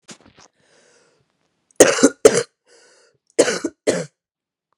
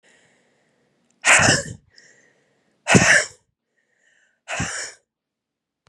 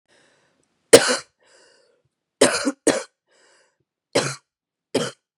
{"cough_length": "4.8 s", "cough_amplitude": 32768, "cough_signal_mean_std_ratio": 0.28, "exhalation_length": "5.9 s", "exhalation_amplitude": 31116, "exhalation_signal_mean_std_ratio": 0.31, "three_cough_length": "5.4 s", "three_cough_amplitude": 32768, "three_cough_signal_mean_std_ratio": 0.26, "survey_phase": "beta (2021-08-13 to 2022-03-07)", "age": "18-44", "gender": "Female", "wearing_mask": "No", "symptom_cough_any": true, "symptom_runny_or_blocked_nose": true, "symptom_sore_throat": true, "symptom_abdominal_pain": true, "symptom_fatigue": true, "symptom_headache": true, "symptom_change_to_sense_of_smell_or_taste": true, "symptom_onset": "4 days", "smoker_status": "Ex-smoker", "respiratory_condition_asthma": false, "respiratory_condition_other": false, "recruitment_source": "Test and Trace", "submission_delay": "1 day", "covid_test_result": "Positive", "covid_test_method": "RT-qPCR", "covid_ct_value": 24.5, "covid_ct_gene": "N gene"}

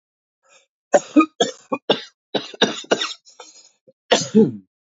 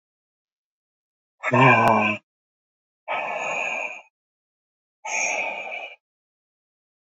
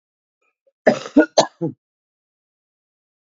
{"three_cough_length": "4.9 s", "three_cough_amplitude": 28200, "three_cough_signal_mean_std_ratio": 0.34, "exhalation_length": "7.1 s", "exhalation_amplitude": 22282, "exhalation_signal_mean_std_ratio": 0.4, "cough_length": "3.3 s", "cough_amplitude": 27687, "cough_signal_mean_std_ratio": 0.24, "survey_phase": "beta (2021-08-13 to 2022-03-07)", "age": "45-64", "gender": "Female", "wearing_mask": "No", "symptom_cough_any": true, "symptom_sore_throat": true, "symptom_fatigue": true, "symptom_fever_high_temperature": true, "symptom_headache": true, "symptom_other": true, "symptom_onset": "2 days", "smoker_status": "Current smoker (11 or more cigarettes per day)", "respiratory_condition_asthma": false, "respiratory_condition_other": false, "recruitment_source": "Test and Trace", "submission_delay": "1 day", "covid_test_result": "Positive", "covid_test_method": "ePCR"}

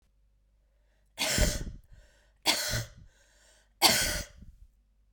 {"three_cough_length": "5.1 s", "three_cough_amplitude": 15426, "three_cough_signal_mean_std_ratio": 0.4, "survey_phase": "beta (2021-08-13 to 2022-03-07)", "age": "18-44", "gender": "Female", "wearing_mask": "No", "symptom_cough_any": true, "symptom_new_continuous_cough": true, "symptom_runny_or_blocked_nose": true, "symptom_shortness_of_breath": true, "symptom_sore_throat": true, "symptom_fatigue": true, "symptom_headache": true, "symptom_other": true, "symptom_onset": "4 days", "smoker_status": "Never smoked", "respiratory_condition_asthma": true, "respiratory_condition_other": false, "recruitment_source": "Test and Trace", "submission_delay": "2 days", "covid_test_result": "Positive", "covid_test_method": "RT-qPCR"}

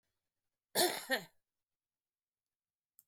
{"cough_length": "3.1 s", "cough_amplitude": 4699, "cough_signal_mean_std_ratio": 0.26, "survey_phase": "beta (2021-08-13 to 2022-03-07)", "age": "65+", "gender": "Female", "wearing_mask": "No", "symptom_none": true, "smoker_status": "Ex-smoker", "respiratory_condition_asthma": true, "respiratory_condition_other": false, "recruitment_source": "REACT", "submission_delay": "2 days", "covid_test_result": "Negative", "covid_test_method": "RT-qPCR", "influenza_a_test_result": "Negative", "influenza_b_test_result": "Negative"}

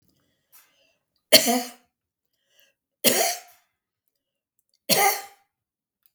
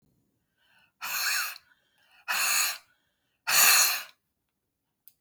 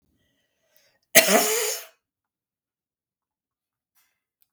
{"three_cough_length": "6.1 s", "three_cough_amplitude": 32768, "three_cough_signal_mean_std_ratio": 0.28, "exhalation_length": "5.2 s", "exhalation_amplitude": 15689, "exhalation_signal_mean_std_ratio": 0.41, "cough_length": "4.5 s", "cough_amplitude": 32768, "cough_signal_mean_std_ratio": 0.25, "survey_phase": "beta (2021-08-13 to 2022-03-07)", "age": "65+", "gender": "Female", "wearing_mask": "No", "symptom_none": true, "smoker_status": "Ex-smoker", "respiratory_condition_asthma": false, "respiratory_condition_other": true, "recruitment_source": "REACT", "submission_delay": "1 day", "covid_test_result": "Negative", "covid_test_method": "RT-qPCR", "influenza_a_test_result": "Negative", "influenza_b_test_result": "Negative"}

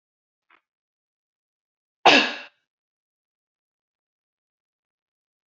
{"cough_length": "5.5 s", "cough_amplitude": 27872, "cough_signal_mean_std_ratio": 0.16, "survey_phase": "beta (2021-08-13 to 2022-03-07)", "age": "18-44", "gender": "Female", "wearing_mask": "No", "symptom_runny_or_blocked_nose": true, "symptom_sore_throat": true, "symptom_other": true, "smoker_status": "Never smoked", "respiratory_condition_asthma": false, "respiratory_condition_other": false, "recruitment_source": "Test and Trace", "submission_delay": "1 day", "covid_test_result": "Negative", "covid_test_method": "RT-qPCR"}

